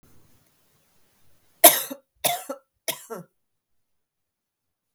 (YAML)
three_cough_length: 4.9 s
three_cough_amplitude: 32768
three_cough_signal_mean_std_ratio: 0.19
survey_phase: beta (2021-08-13 to 2022-03-07)
age: 45-64
gender: Female
wearing_mask: 'No'
symptom_cough_any: true
symptom_runny_or_blocked_nose: true
symptom_fatigue: true
symptom_headache: true
smoker_status: Never smoked
respiratory_condition_asthma: false
respiratory_condition_other: false
recruitment_source: REACT
submission_delay: 1 day
covid_test_result: Negative
covid_test_method: RT-qPCR
influenza_a_test_result: Negative
influenza_b_test_result: Negative